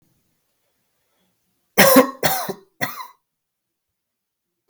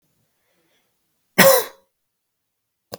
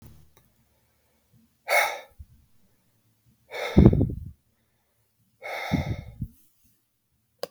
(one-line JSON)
{"three_cough_length": "4.7 s", "three_cough_amplitude": 32768, "three_cough_signal_mean_std_ratio": 0.27, "cough_length": "3.0 s", "cough_amplitude": 32768, "cough_signal_mean_std_ratio": 0.23, "exhalation_length": "7.5 s", "exhalation_amplitude": 32766, "exhalation_signal_mean_std_ratio": 0.28, "survey_phase": "beta (2021-08-13 to 2022-03-07)", "age": "18-44", "gender": "Male", "wearing_mask": "No", "symptom_runny_or_blocked_nose": true, "symptom_fatigue": true, "symptom_headache": true, "symptom_other": true, "smoker_status": "Never smoked", "respiratory_condition_asthma": false, "respiratory_condition_other": false, "recruitment_source": "Test and Trace", "submission_delay": "2 days", "covid_test_result": "Positive", "covid_test_method": "RT-qPCR"}